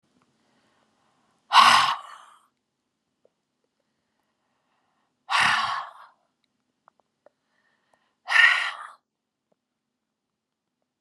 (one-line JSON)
{"exhalation_length": "11.0 s", "exhalation_amplitude": 28787, "exhalation_signal_mean_std_ratio": 0.26, "survey_phase": "beta (2021-08-13 to 2022-03-07)", "age": "45-64", "gender": "Female", "wearing_mask": "No", "symptom_none": true, "smoker_status": "Never smoked", "respiratory_condition_asthma": false, "respiratory_condition_other": false, "recruitment_source": "REACT", "submission_delay": "3 days", "covid_test_result": "Negative", "covid_test_method": "RT-qPCR", "influenza_a_test_result": "Unknown/Void", "influenza_b_test_result": "Unknown/Void"}